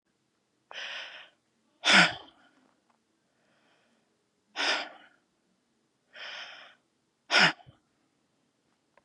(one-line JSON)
{"exhalation_length": "9.0 s", "exhalation_amplitude": 15289, "exhalation_signal_mean_std_ratio": 0.25, "survey_phase": "beta (2021-08-13 to 2022-03-07)", "age": "18-44", "gender": "Female", "wearing_mask": "No", "symptom_cough_any": true, "symptom_runny_or_blocked_nose": true, "symptom_headache": true, "symptom_onset": "13 days", "smoker_status": "Current smoker (11 or more cigarettes per day)", "respiratory_condition_asthma": false, "respiratory_condition_other": false, "recruitment_source": "REACT", "submission_delay": "4 days", "covid_test_result": "Negative", "covid_test_method": "RT-qPCR", "influenza_a_test_result": "Negative", "influenza_b_test_result": "Negative"}